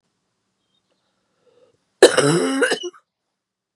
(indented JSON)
{
  "cough_length": "3.8 s",
  "cough_amplitude": 32768,
  "cough_signal_mean_std_ratio": 0.31,
  "survey_phase": "beta (2021-08-13 to 2022-03-07)",
  "age": "45-64",
  "gender": "Female",
  "wearing_mask": "No",
  "symptom_cough_any": true,
  "symptom_runny_or_blocked_nose": true,
  "symptom_shortness_of_breath": true,
  "symptom_sore_throat": true,
  "symptom_fatigue": true,
  "symptom_headache": true,
  "symptom_onset": "3 days",
  "smoker_status": "Never smoked",
  "respiratory_condition_asthma": false,
  "respiratory_condition_other": false,
  "recruitment_source": "Test and Trace",
  "submission_delay": "2 days",
  "covid_test_result": "Positive",
  "covid_test_method": "RT-qPCR",
  "covid_ct_value": 28.8,
  "covid_ct_gene": "ORF1ab gene",
  "covid_ct_mean": 31.5,
  "covid_viral_load": "46 copies/ml",
  "covid_viral_load_category": "Minimal viral load (< 10K copies/ml)"
}